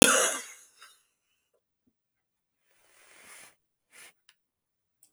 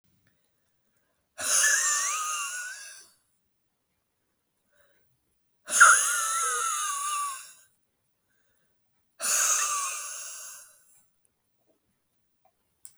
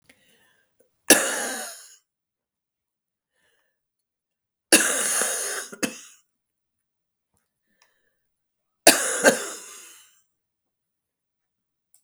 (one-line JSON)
{"cough_length": "5.1 s", "cough_amplitude": 32768, "cough_signal_mean_std_ratio": 0.2, "exhalation_length": "13.0 s", "exhalation_amplitude": 20199, "exhalation_signal_mean_std_ratio": 0.4, "three_cough_length": "12.0 s", "three_cough_amplitude": 32768, "three_cough_signal_mean_std_ratio": 0.27, "survey_phase": "beta (2021-08-13 to 2022-03-07)", "age": "45-64", "gender": "Female", "wearing_mask": "No", "symptom_cough_any": true, "symptom_runny_or_blocked_nose": true, "smoker_status": "Never smoked", "respiratory_condition_asthma": true, "respiratory_condition_other": false, "recruitment_source": "Test and Trace", "submission_delay": "2 days", "covid_test_result": "Positive", "covid_test_method": "RT-qPCR", "covid_ct_value": 20.0, "covid_ct_gene": "N gene"}